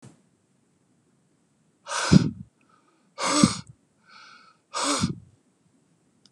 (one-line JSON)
{"exhalation_length": "6.3 s", "exhalation_amplitude": 27520, "exhalation_signal_mean_std_ratio": 0.29, "survey_phase": "beta (2021-08-13 to 2022-03-07)", "age": "65+", "gender": "Male", "wearing_mask": "No", "symptom_none": true, "smoker_status": "Current smoker (1 to 10 cigarettes per day)", "respiratory_condition_asthma": false, "respiratory_condition_other": false, "recruitment_source": "REACT", "submission_delay": "2 days", "covid_test_result": "Negative", "covid_test_method": "RT-qPCR", "influenza_a_test_result": "Negative", "influenza_b_test_result": "Negative"}